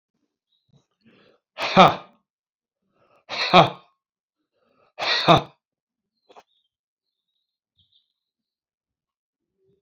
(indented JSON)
{
  "exhalation_length": "9.8 s",
  "exhalation_amplitude": 27919,
  "exhalation_signal_mean_std_ratio": 0.21,
  "survey_phase": "beta (2021-08-13 to 2022-03-07)",
  "age": "65+",
  "gender": "Male",
  "wearing_mask": "No",
  "symptom_none": true,
  "symptom_onset": "5 days",
  "smoker_status": "Ex-smoker",
  "respiratory_condition_asthma": true,
  "respiratory_condition_other": false,
  "recruitment_source": "REACT",
  "submission_delay": "2 days",
  "covid_test_result": "Negative",
  "covid_test_method": "RT-qPCR"
}